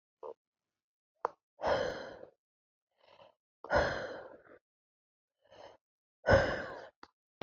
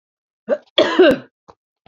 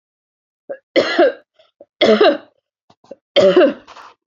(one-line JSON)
{"exhalation_length": "7.4 s", "exhalation_amplitude": 9029, "exhalation_signal_mean_std_ratio": 0.32, "cough_length": "1.9 s", "cough_amplitude": 32768, "cough_signal_mean_std_ratio": 0.38, "three_cough_length": "4.3 s", "three_cough_amplitude": 30386, "three_cough_signal_mean_std_ratio": 0.42, "survey_phase": "beta (2021-08-13 to 2022-03-07)", "age": "45-64", "gender": "Female", "wearing_mask": "No", "symptom_runny_or_blocked_nose": true, "symptom_shortness_of_breath": true, "symptom_fatigue": true, "symptom_onset": "12 days", "smoker_status": "Never smoked", "respiratory_condition_asthma": true, "respiratory_condition_other": false, "recruitment_source": "REACT", "submission_delay": "2 days", "covid_test_result": "Negative", "covid_test_method": "RT-qPCR", "covid_ct_value": 38.9, "covid_ct_gene": "N gene", "influenza_a_test_result": "Negative", "influenza_b_test_result": "Negative"}